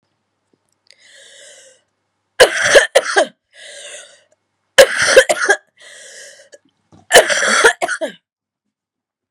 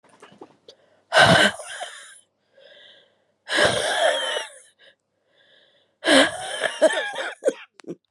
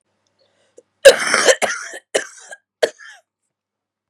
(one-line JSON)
{"three_cough_length": "9.3 s", "three_cough_amplitude": 32768, "three_cough_signal_mean_std_ratio": 0.35, "exhalation_length": "8.1 s", "exhalation_amplitude": 28519, "exhalation_signal_mean_std_ratio": 0.43, "cough_length": "4.1 s", "cough_amplitude": 32768, "cough_signal_mean_std_ratio": 0.29, "survey_phase": "beta (2021-08-13 to 2022-03-07)", "age": "18-44", "gender": "Female", "wearing_mask": "No", "symptom_cough_any": true, "symptom_runny_or_blocked_nose": true, "symptom_sore_throat": true, "symptom_fatigue": true, "symptom_headache": true, "symptom_onset": "2 days", "smoker_status": "Never smoked", "respiratory_condition_asthma": false, "respiratory_condition_other": false, "recruitment_source": "Test and Trace", "submission_delay": "2 days", "covid_test_result": "Positive", "covid_test_method": "RT-qPCR", "covid_ct_value": 26.8, "covid_ct_gene": "ORF1ab gene"}